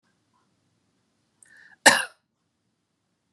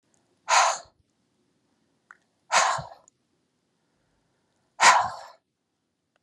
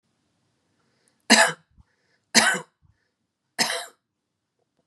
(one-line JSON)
{"cough_length": "3.3 s", "cough_amplitude": 32767, "cough_signal_mean_std_ratio": 0.16, "exhalation_length": "6.2 s", "exhalation_amplitude": 22518, "exhalation_signal_mean_std_ratio": 0.29, "three_cough_length": "4.9 s", "three_cough_amplitude": 31490, "three_cough_signal_mean_std_ratio": 0.26, "survey_phase": "beta (2021-08-13 to 2022-03-07)", "age": "45-64", "gender": "Female", "wearing_mask": "No", "symptom_none": true, "symptom_onset": "4 days", "smoker_status": "Ex-smoker", "respiratory_condition_asthma": true, "respiratory_condition_other": false, "recruitment_source": "REACT", "submission_delay": "2 days", "covid_test_result": "Negative", "covid_test_method": "RT-qPCR"}